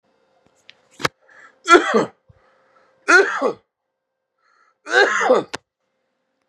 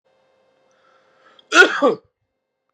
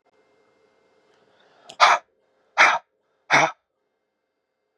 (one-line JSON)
{"three_cough_length": "6.5 s", "three_cough_amplitude": 32768, "three_cough_signal_mean_std_ratio": 0.34, "cough_length": "2.7 s", "cough_amplitude": 32768, "cough_signal_mean_std_ratio": 0.28, "exhalation_length": "4.8 s", "exhalation_amplitude": 30010, "exhalation_signal_mean_std_ratio": 0.27, "survey_phase": "beta (2021-08-13 to 2022-03-07)", "age": "18-44", "gender": "Male", "wearing_mask": "No", "symptom_fatigue": true, "symptom_onset": "12 days", "smoker_status": "Ex-smoker", "respiratory_condition_asthma": true, "respiratory_condition_other": false, "recruitment_source": "REACT", "submission_delay": "1 day", "covid_test_result": "Negative", "covid_test_method": "RT-qPCR"}